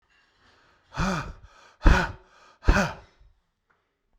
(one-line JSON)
{"exhalation_length": "4.2 s", "exhalation_amplitude": 23813, "exhalation_signal_mean_std_ratio": 0.31, "survey_phase": "beta (2021-08-13 to 2022-03-07)", "age": "65+", "gender": "Male", "wearing_mask": "No", "symptom_none": true, "smoker_status": "Ex-smoker", "respiratory_condition_asthma": false, "respiratory_condition_other": false, "recruitment_source": "REACT", "submission_delay": "2 days", "covid_test_result": "Negative", "covid_test_method": "RT-qPCR"}